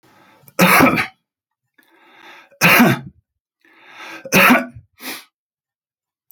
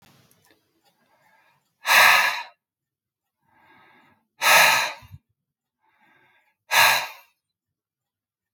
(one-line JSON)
{"three_cough_length": "6.3 s", "three_cough_amplitude": 32210, "three_cough_signal_mean_std_ratio": 0.37, "exhalation_length": "8.5 s", "exhalation_amplitude": 27275, "exhalation_signal_mean_std_ratio": 0.31, "survey_phase": "alpha (2021-03-01 to 2021-08-12)", "age": "65+", "gender": "Male", "wearing_mask": "No", "symptom_none": true, "smoker_status": "Ex-smoker", "respiratory_condition_asthma": false, "respiratory_condition_other": false, "recruitment_source": "REACT", "submission_delay": "2 days", "covid_test_result": "Negative", "covid_test_method": "RT-qPCR"}